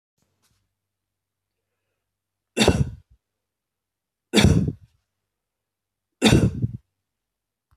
three_cough_length: 7.8 s
three_cough_amplitude: 24412
three_cough_signal_mean_std_ratio: 0.28
survey_phase: beta (2021-08-13 to 2022-03-07)
age: 45-64
gender: Male
wearing_mask: 'No'
symptom_none: true
smoker_status: Never smoked
respiratory_condition_asthma: false
respiratory_condition_other: false
recruitment_source: REACT
submission_delay: 1 day
covid_test_result: Negative
covid_test_method: RT-qPCR
influenza_a_test_result: Negative
influenza_b_test_result: Negative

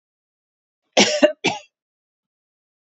cough_length: 2.8 s
cough_amplitude: 32767
cough_signal_mean_std_ratio: 0.28
survey_phase: beta (2021-08-13 to 2022-03-07)
age: 45-64
gender: Female
wearing_mask: 'No'
symptom_cough_any: true
symptom_sore_throat: true
smoker_status: Ex-smoker
respiratory_condition_asthma: false
respiratory_condition_other: false
recruitment_source: Test and Trace
submission_delay: 2 days
covid_test_result: Negative
covid_test_method: RT-qPCR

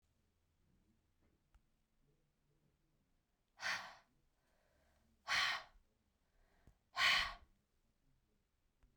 exhalation_length: 9.0 s
exhalation_amplitude: 2501
exhalation_signal_mean_std_ratio: 0.26
survey_phase: beta (2021-08-13 to 2022-03-07)
age: 45-64
gender: Female
wearing_mask: 'No'
symptom_none: true
smoker_status: Never smoked
respiratory_condition_asthma: false
respiratory_condition_other: false
recruitment_source: REACT
submission_delay: 2 days
covid_test_result: Negative
covid_test_method: RT-qPCR
influenza_a_test_result: Negative
influenza_b_test_result: Negative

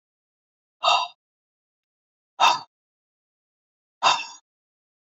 exhalation_length: 5.0 s
exhalation_amplitude: 20661
exhalation_signal_mean_std_ratio: 0.27
survey_phase: beta (2021-08-13 to 2022-03-07)
age: 45-64
gender: Female
wearing_mask: 'No'
symptom_none: true
smoker_status: Ex-smoker
respiratory_condition_asthma: false
respiratory_condition_other: false
recruitment_source: REACT
submission_delay: 0 days
covid_test_result: Negative
covid_test_method: RT-qPCR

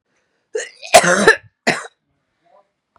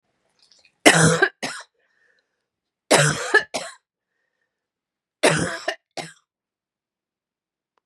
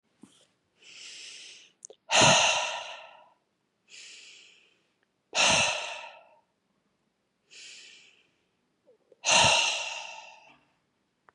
cough_length: 3.0 s
cough_amplitude: 32768
cough_signal_mean_std_ratio: 0.32
three_cough_length: 7.9 s
three_cough_amplitude: 32767
three_cough_signal_mean_std_ratio: 0.31
exhalation_length: 11.3 s
exhalation_amplitude: 14312
exhalation_signal_mean_std_ratio: 0.35
survey_phase: beta (2021-08-13 to 2022-03-07)
age: 45-64
gender: Female
wearing_mask: 'No'
symptom_cough_any: true
symptom_runny_or_blocked_nose: true
symptom_shortness_of_breath: true
symptom_headache: true
smoker_status: Ex-smoker
respiratory_condition_asthma: false
respiratory_condition_other: false
recruitment_source: Test and Trace
submission_delay: 2 days
covid_test_result: Positive
covid_test_method: LFT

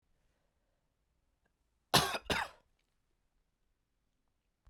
cough_length: 4.7 s
cough_amplitude: 7311
cough_signal_mean_std_ratio: 0.21
survey_phase: beta (2021-08-13 to 2022-03-07)
age: 18-44
gender: Male
wearing_mask: 'No'
symptom_cough_any: true
symptom_runny_or_blocked_nose: true
symptom_sore_throat: true
symptom_abdominal_pain: true
symptom_fatigue: true
symptom_headache: true
smoker_status: Never smoked
respiratory_condition_asthma: false
respiratory_condition_other: false
recruitment_source: Test and Trace
submission_delay: 1 day
covid_test_method: LFT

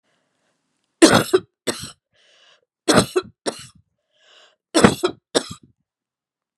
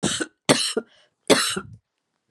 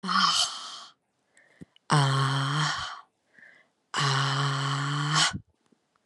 three_cough_length: 6.6 s
three_cough_amplitude: 32768
three_cough_signal_mean_std_ratio: 0.28
cough_length: 2.3 s
cough_amplitude: 30700
cough_signal_mean_std_ratio: 0.42
exhalation_length: 6.1 s
exhalation_amplitude: 15012
exhalation_signal_mean_std_ratio: 0.64
survey_phase: beta (2021-08-13 to 2022-03-07)
age: 45-64
gender: Female
wearing_mask: 'No'
symptom_cough_any: true
symptom_runny_or_blocked_nose: true
symptom_sore_throat: true
symptom_onset: 5 days
smoker_status: Never smoked
respiratory_condition_asthma: false
respiratory_condition_other: false
recruitment_source: Test and Trace
submission_delay: 1 day
covid_test_result: Positive
covid_test_method: RT-qPCR
covid_ct_value: 23.6
covid_ct_gene: N gene
covid_ct_mean: 23.9
covid_viral_load: 14000 copies/ml
covid_viral_load_category: Low viral load (10K-1M copies/ml)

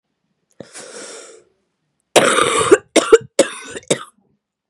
cough_length: 4.7 s
cough_amplitude: 32768
cough_signal_mean_std_ratio: 0.35
survey_phase: beta (2021-08-13 to 2022-03-07)
age: 18-44
gender: Female
wearing_mask: 'No'
symptom_new_continuous_cough: true
symptom_runny_or_blocked_nose: true
symptom_sore_throat: true
smoker_status: Ex-smoker
respiratory_condition_asthma: true
respiratory_condition_other: false
recruitment_source: Test and Trace
submission_delay: 1 day
covid_test_result: Positive
covid_test_method: LFT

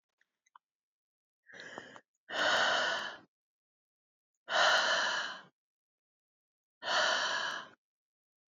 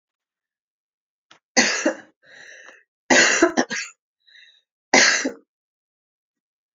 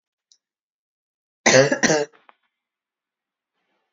exhalation_length: 8.5 s
exhalation_amplitude: 5779
exhalation_signal_mean_std_ratio: 0.44
three_cough_length: 6.7 s
three_cough_amplitude: 29944
three_cough_signal_mean_std_ratio: 0.34
cough_length: 3.9 s
cough_amplitude: 28209
cough_signal_mean_std_ratio: 0.27
survey_phase: alpha (2021-03-01 to 2021-08-12)
age: 18-44
gender: Female
wearing_mask: 'No'
symptom_none: true
smoker_status: Never smoked
respiratory_condition_asthma: false
respiratory_condition_other: false
recruitment_source: REACT
submission_delay: 2 days
covid_test_result: Negative
covid_test_method: RT-qPCR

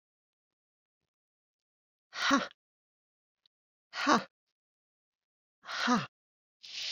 exhalation_length: 6.9 s
exhalation_amplitude: 9410
exhalation_signal_mean_std_ratio: 0.28
survey_phase: beta (2021-08-13 to 2022-03-07)
age: 65+
gender: Female
wearing_mask: 'No'
symptom_none: true
smoker_status: Never smoked
respiratory_condition_asthma: false
respiratory_condition_other: false
recruitment_source: REACT
submission_delay: 1 day
covid_test_result: Negative
covid_test_method: RT-qPCR
influenza_a_test_result: Negative
influenza_b_test_result: Negative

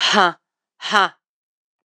exhalation_length: 1.9 s
exhalation_amplitude: 26028
exhalation_signal_mean_std_ratio: 0.37
survey_phase: beta (2021-08-13 to 2022-03-07)
age: 45-64
gender: Female
wearing_mask: 'No'
symptom_cough_any: true
symptom_runny_or_blocked_nose: true
symptom_sore_throat: true
symptom_fatigue: true
symptom_fever_high_temperature: true
symptom_headache: true
symptom_other: true
symptom_onset: 8 days
smoker_status: Never smoked
respiratory_condition_asthma: false
respiratory_condition_other: false
recruitment_source: Test and Trace
submission_delay: 1 day
covid_test_result: Positive
covid_test_method: RT-qPCR
covid_ct_value: 30.3
covid_ct_gene: N gene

